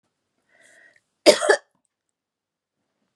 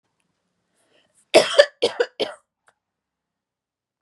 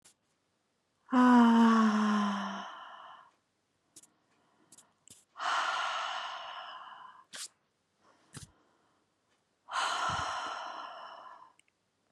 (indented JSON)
{
  "cough_length": "3.2 s",
  "cough_amplitude": 32318,
  "cough_signal_mean_std_ratio": 0.2,
  "three_cough_length": "4.0 s",
  "three_cough_amplitude": 32744,
  "three_cough_signal_mean_std_ratio": 0.23,
  "exhalation_length": "12.1 s",
  "exhalation_amplitude": 7637,
  "exhalation_signal_mean_std_ratio": 0.43,
  "survey_phase": "beta (2021-08-13 to 2022-03-07)",
  "age": "18-44",
  "gender": "Female",
  "wearing_mask": "No",
  "symptom_none": true,
  "smoker_status": "Never smoked",
  "respiratory_condition_asthma": false,
  "respiratory_condition_other": false,
  "recruitment_source": "REACT",
  "submission_delay": "1 day",
  "covid_test_result": "Negative",
  "covid_test_method": "RT-qPCR"
}